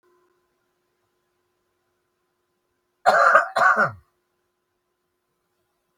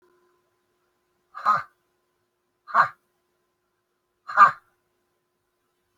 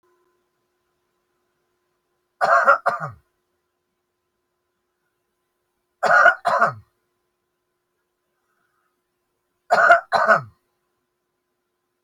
{"cough_length": "6.0 s", "cough_amplitude": 27376, "cough_signal_mean_std_ratio": 0.28, "exhalation_length": "6.0 s", "exhalation_amplitude": 27346, "exhalation_signal_mean_std_ratio": 0.21, "three_cough_length": "12.0 s", "three_cough_amplitude": 29522, "three_cough_signal_mean_std_ratio": 0.28, "survey_phase": "beta (2021-08-13 to 2022-03-07)", "age": "65+", "gender": "Male", "wearing_mask": "No", "symptom_none": true, "smoker_status": "Current smoker (e-cigarettes or vapes only)", "respiratory_condition_asthma": false, "respiratory_condition_other": false, "recruitment_source": "Test and Trace", "submission_delay": "0 days", "covid_test_result": "Negative", "covid_test_method": "LFT"}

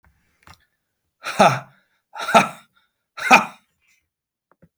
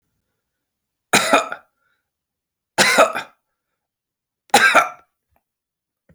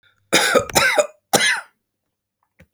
{"exhalation_length": "4.8 s", "exhalation_amplitude": 32767, "exhalation_signal_mean_std_ratio": 0.27, "three_cough_length": "6.1 s", "three_cough_amplitude": 32768, "three_cough_signal_mean_std_ratio": 0.31, "cough_length": "2.7 s", "cough_amplitude": 32768, "cough_signal_mean_std_ratio": 0.46, "survey_phase": "beta (2021-08-13 to 2022-03-07)", "age": "45-64", "gender": "Male", "wearing_mask": "No", "symptom_none": true, "symptom_onset": "3 days", "smoker_status": "Never smoked", "respiratory_condition_asthma": false, "respiratory_condition_other": false, "recruitment_source": "REACT", "submission_delay": "2 days", "covid_test_result": "Negative", "covid_test_method": "RT-qPCR"}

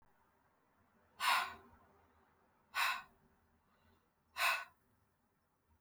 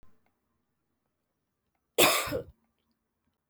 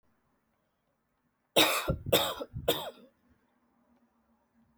{"exhalation_length": "5.8 s", "exhalation_amplitude": 3161, "exhalation_signal_mean_std_ratio": 0.31, "cough_length": "3.5 s", "cough_amplitude": 12798, "cough_signal_mean_std_ratio": 0.25, "three_cough_length": "4.8 s", "three_cough_amplitude": 12022, "three_cough_signal_mean_std_ratio": 0.32, "survey_phase": "alpha (2021-03-01 to 2021-08-12)", "age": "18-44", "gender": "Female", "wearing_mask": "No", "symptom_cough_any": true, "symptom_new_continuous_cough": true, "symptom_fatigue": true, "symptom_fever_high_temperature": true, "symptom_headache": true, "symptom_onset": "2 days", "smoker_status": "Never smoked", "respiratory_condition_asthma": false, "respiratory_condition_other": false, "recruitment_source": "Test and Trace", "submission_delay": "2 days", "covid_test_result": "Positive", "covid_test_method": "RT-qPCR", "covid_ct_value": 19.8, "covid_ct_gene": "N gene", "covid_ct_mean": 20.3, "covid_viral_load": "220000 copies/ml", "covid_viral_load_category": "Low viral load (10K-1M copies/ml)"}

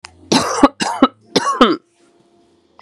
{"three_cough_length": "2.8 s", "three_cough_amplitude": 32768, "three_cough_signal_mean_std_ratio": 0.43, "survey_phase": "beta (2021-08-13 to 2022-03-07)", "age": "45-64", "gender": "Female", "wearing_mask": "Yes", "symptom_cough_any": true, "smoker_status": "Prefer not to say", "respiratory_condition_asthma": false, "respiratory_condition_other": false, "recruitment_source": "REACT", "submission_delay": "2 days", "covid_test_result": "Negative", "covid_test_method": "RT-qPCR", "influenza_a_test_result": "Negative", "influenza_b_test_result": "Negative"}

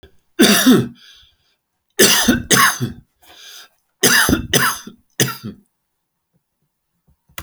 {"three_cough_length": "7.4 s", "three_cough_amplitude": 32768, "three_cough_signal_mean_std_ratio": 0.43, "survey_phase": "beta (2021-08-13 to 2022-03-07)", "age": "65+", "gender": "Male", "wearing_mask": "No", "symptom_none": true, "smoker_status": "Ex-smoker", "respiratory_condition_asthma": false, "respiratory_condition_other": true, "recruitment_source": "REACT", "submission_delay": "1 day", "covid_test_result": "Negative", "covid_test_method": "RT-qPCR"}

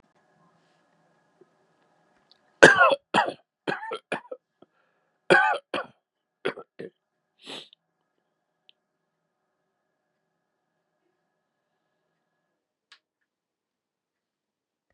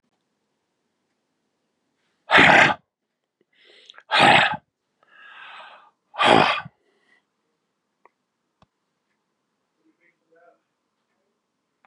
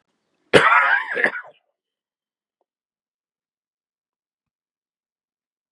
{"three_cough_length": "14.9 s", "three_cough_amplitude": 32768, "three_cough_signal_mean_std_ratio": 0.19, "exhalation_length": "11.9 s", "exhalation_amplitude": 32615, "exhalation_signal_mean_std_ratio": 0.26, "cough_length": "5.7 s", "cough_amplitude": 32768, "cough_signal_mean_std_ratio": 0.26, "survey_phase": "beta (2021-08-13 to 2022-03-07)", "age": "45-64", "gender": "Male", "wearing_mask": "Yes", "symptom_runny_or_blocked_nose": true, "symptom_fatigue": true, "symptom_other": true, "symptom_onset": "9 days", "smoker_status": "Ex-smoker", "respiratory_condition_asthma": false, "respiratory_condition_other": false, "recruitment_source": "Test and Trace", "submission_delay": "1 day", "covid_test_result": "Positive", "covid_test_method": "RT-qPCR", "covid_ct_value": 26.4, "covid_ct_gene": "ORF1ab gene"}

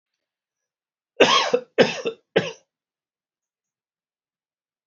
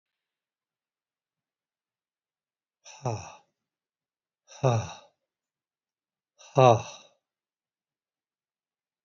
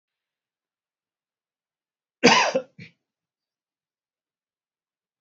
{"cough_length": "4.9 s", "cough_amplitude": 28203, "cough_signal_mean_std_ratio": 0.27, "exhalation_length": "9.0 s", "exhalation_amplitude": 20721, "exhalation_signal_mean_std_ratio": 0.18, "three_cough_length": "5.2 s", "three_cough_amplitude": 27047, "three_cough_signal_mean_std_ratio": 0.19, "survey_phase": "beta (2021-08-13 to 2022-03-07)", "age": "65+", "gender": "Male", "wearing_mask": "No", "symptom_cough_any": true, "symptom_runny_or_blocked_nose": true, "symptom_sore_throat": true, "symptom_abdominal_pain": true, "symptom_fatigue": true, "symptom_headache": true, "smoker_status": "Never smoked", "respiratory_condition_asthma": false, "respiratory_condition_other": false, "recruitment_source": "Test and Trace", "submission_delay": "1 day", "covid_test_result": "Positive", "covid_test_method": "RT-qPCR", "covid_ct_value": 17.2, "covid_ct_gene": "ORF1ab gene", "covid_ct_mean": 17.4, "covid_viral_load": "1900000 copies/ml", "covid_viral_load_category": "High viral load (>1M copies/ml)"}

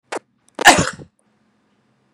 {"cough_length": "2.1 s", "cough_amplitude": 32768, "cough_signal_mean_std_ratio": 0.26, "survey_phase": "beta (2021-08-13 to 2022-03-07)", "age": "18-44", "gender": "Female", "wearing_mask": "No", "symptom_none": true, "smoker_status": "Ex-smoker", "respiratory_condition_asthma": false, "respiratory_condition_other": false, "recruitment_source": "REACT", "submission_delay": "1 day", "covid_test_result": "Negative", "covid_test_method": "RT-qPCR", "influenza_a_test_result": "Negative", "influenza_b_test_result": "Negative"}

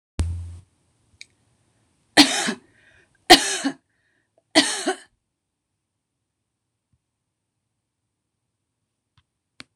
{"three_cough_length": "9.8 s", "three_cough_amplitude": 26028, "three_cough_signal_mean_std_ratio": 0.22, "survey_phase": "beta (2021-08-13 to 2022-03-07)", "age": "45-64", "gender": "Female", "wearing_mask": "No", "symptom_headache": true, "smoker_status": "Never smoked", "respiratory_condition_asthma": false, "respiratory_condition_other": false, "recruitment_source": "REACT", "submission_delay": "1 day", "covid_test_result": "Negative", "covid_test_method": "RT-qPCR"}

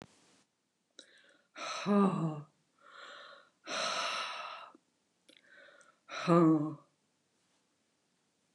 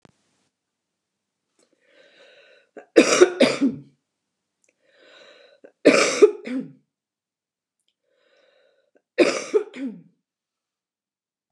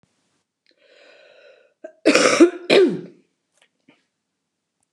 {"exhalation_length": "8.5 s", "exhalation_amplitude": 7344, "exhalation_signal_mean_std_ratio": 0.37, "three_cough_length": "11.5 s", "three_cough_amplitude": 29203, "three_cough_signal_mean_std_ratio": 0.27, "cough_length": "4.9 s", "cough_amplitude": 29203, "cough_signal_mean_std_ratio": 0.31, "survey_phase": "beta (2021-08-13 to 2022-03-07)", "age": "65+", "gender": "Female", "wearing_mask": "No", "symptom_cough_any": true, "smoker_status": "Never smoked", "respiratory_condition_asthma": false, "respiratory_condition_other": false, "recruitment_source": "REACT", "submission_delay": "2 days", "covid_test_result": "Negative", "covid_test_method": "RT-qPCR", "influenza_a_test_result": "Negative", "influenza_b_test_result": "Negative"}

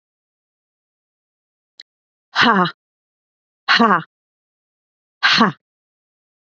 {"exhalation_length": "6.6 s", "exhalation_amplitude": 28952, "exhalation_signal_mean_std_ratio": 0.29, "survey_phase": "beta (2021-08-13 to 2022-03-07)", "age": "45-64", "gender": "Female", "wearing_mask": "No", "symptom_change_to_sense_of_smell_or_taste": true, "symptom_loss_of_taste": true, "smoker_status": "Never smoked", "respiratory_condition_asthma": false, "respiratory_condition_other": false, "recruitment_source": "Test and Trace", "submission_delay": "1 day", "covid_test_result": "Positive", "covid_test_method": "RT-qPCR", "covid_ct_value": 21.1, "covid_ct_gene": "ORF1ab gene", "covid_ct_mean": 21.3, "covid_viral_load": "100000 copies/ml", "covid_viral_load_category": "Low viral load (10K-1M copies/ml)"}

